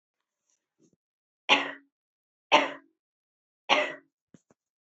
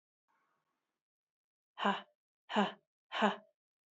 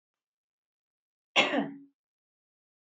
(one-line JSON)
{"three_cough_length": "4.9 s", "three_cough_amplitude": 19152, "three_cough_signal_mean_std_ratio": 0.24, "exhalation_length": "3.9 s", "exhalation_amplitude": 5374, "exhalation_signal_mean_std_ratio": 0.29, "cough_length": "3.0 s", "cough_amplitude": 13386, "cough_signal_mean_std_ratio": 0.25, "survey_phase": "beta (2021-08-13 to 2022-03-07)", "age": "18-44", "gender": "Female", "wearing_mask": "No", "symptom_runny_or_blocked_nose": true, "symptom_sore_throat": true, "symptom_onset": "6 days", "smoker_status": "Never smoked", "respiratory_condition_asthma": false, "respiratory_condition_other": false, "recruitment_source": "Test and Trace", "submission_delay": "3 days", "covid_test_result": "Positive", "covid_test_method": "RT-qPCR"}